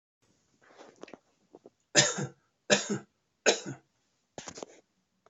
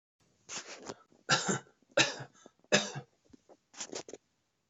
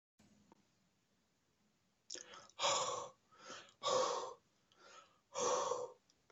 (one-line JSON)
{"three_cough_length": "5.3 s", "three_cough_amplitude": 16521, "three_cough_signal_mean_std_ratio": 0.27, "cough_length": "4.7 s", "cough_amplitude": 11631, "cough_signal_mean_std_ratio": 0.33, "exhalation_length": "6.3 s", "exhalation_amplitude": 2388, "exhalation_signal_mean_std_ratio": 0.43, "survey_phase": "alpha (2021-03-01 to 2021-08-12)", "age": "45-64", "gender": "Male", "wearing_mask": "No", "symptom_none": true, "smoker_status": "Ex-smoker", "respiratory_condition_asthma": false, "respiratory_condition_other": false, "recruitment_source": "REACT", "submission_delay": "2 days", "covid_test_result": "Negative", "covid_test_method": "RT-qPCR"}